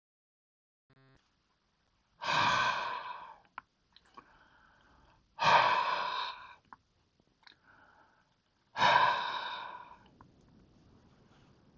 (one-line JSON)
{"exhalation_length": "11.8 s", "exhalation_amplitude": 7528, "exhalation_signal_mean_std_ratio": 0.37, "survey_phase": "beta (2021-08-13 to 2022-03-07)", "age": "65+", "gender": "Male", "wearing_mask": "No", "symptom_none": true, "smoker_status": "Ex-smoker", "respiratory_condition_asthma": false, "respiratory_condition_other": false, "recruitment_source": "REACT", "submission_delay": "4 days", "covid_test_result": "Negative", "covid_test_method": "RT-qPCR", "influenza_a_test_result": "Unknown/Void", "influenza_b_test_result": "Unknown/Void"}